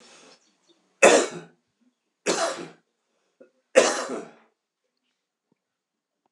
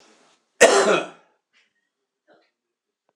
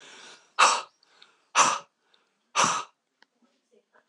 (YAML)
three_cough_length: 6.3 s
three_cough_amplitude: 26028
three_cough_signal_mean_std_ratio: 0.27
cough_length: 3.2 s
cough_amplitude: 26028
cough_signal_mean_std_ratio: 0.28
exhalation_length: 4.1 s
exhalation_amplitude: 22609
exhalation_signal_mean_std_ratio: 0.33
survey_phase: alpha (2021-03-01 to 2021-08-12)
age: 65+
gender: Male
wearing_mask: 'No'
symptom_cough_any: true
symptom_abdominal_pain: true
symptom_change_to_sense_of_smell_or_taste: true
symptom_onset: 3 days
smoker_status: Never smoked
respiratory_condition_asthma: false
respiratory_condition_other: false
recruitment_source: Test and Trace
submission_delay: 2 days
covid_test_result: Positive
covid_test_method: ePCR